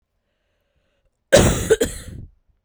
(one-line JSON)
{"cough_length": "2.6 s", "cough_amplitude": 32768, "cough_signal_mean_std_ratio": 0.34, "survey_phase": "beta (2021-08-13 to 2022-03-07)", "age": "18-44", "gender": "Female", "wearing_mask": "No", "symptom_runny_or_blocked_nose": true, "symptom_sore_throat": true, "symptom_fatigue": true, "symptom_fever_high_temperature": true, "symptom_headache": true, "symptom_change_to_sense_of_smell_or_taste": true, "symptom_loss_of_taste": true, "symptom_onset": "3 days", "smoker_status": "Current smoker (e-cigarettes or vapes only)", "respiratory_condition_asthma": false, "respiratory_condition_other": false, "recruitment_source": "Test and Trace", "submission_delay": "2 days", "covid_test_result": "Positive", "covid_test_method": "RT-qPCR", "covid_ct_value": 28.6, "covid_ct_gene": "ORF1ab gene", "covid_ct_mean": 29.5, "covid_viral_load": "210 copies/ml", "covid_viral_load_category": "Minimal viral load (< 10K copies/ml)"}